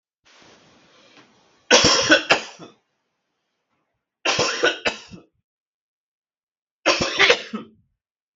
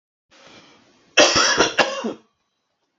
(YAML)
three_cough_length: 8.4 s
three_cough_amplitude: 32768
three_cough_signal_mean_std_ratio: 0.35
cough_length: 3.0 s
cough_amplitude: 32768
cough_signal_mean_std_ratio: 0.4
survey_phase: beta (2021-08-13 to 2022-03-07)
age: 45-64
gender: Male
wearing_mask: 'No'
symptom_none: true
smoker_status: Never smoked
respiratory_condition_asthma: false
respiratory_condition_other: false
recruitment_source: REACT
submission_delay: 3 days
covid_test_result: Negative
covid_test_method: RT-qPCR
influenza_a_test_result: Negative
influenza_b_test_result: Negative